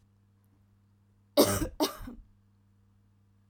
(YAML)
cough_length: 3.5 s
cough_amplitude: 12608
cough_signal_mean_std_ratio: 0.28
survey_phase: beta (2021-08-13 to 2022-03-07)
age: 18-44
gender: Female
wearing_mask: 'No'
symptom_abdominal_pain: true
symptom_onset: 7 days
smoker_status: Never smoked
respiratory_condition_asthma: false
respiratory_condition_other: false
recruitment_source: REACT
submission_delay: 4 days
covid_test_result: Negative
covid_test_method: RT-qPCR
influenza_a_test_result: Negative
influenza_b_test_result: Negative